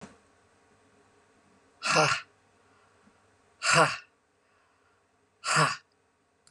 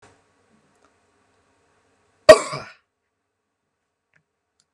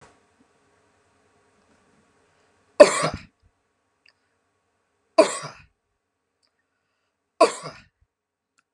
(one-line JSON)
{"exhalation_length": "6.5 s", "exhalation_amplitude": 12300, "exhalation_signal_mean_std_ratio": 0.31, "cough_length": "4.7 s", "cough_amplitude": 32768, "cough_signal_mean_std_ratio": 0.12, "three_cough_length": "8.7 s", "three_cough_amplitude": 32768, "three_cough_signal_mean_std_ratio": 0.16, "survey_phase": "beta (2021-08-13 to 2022-03-07)", "age": "45-64", "gender": "Female", "wearing_mask": "No", "symptom_none": true, "smoker_status": "Never smoked", "respiratory_condition_asthma": true, "respiratory_condition_other": false, "recruitment_source": "REACT", "submission_delay": "2 days", "covid_test_result": "Negative", "covid_test_method": "RT-qPCR", "influenza_a_test_result": "Negative", "influenza_b_test_result": "Negative"}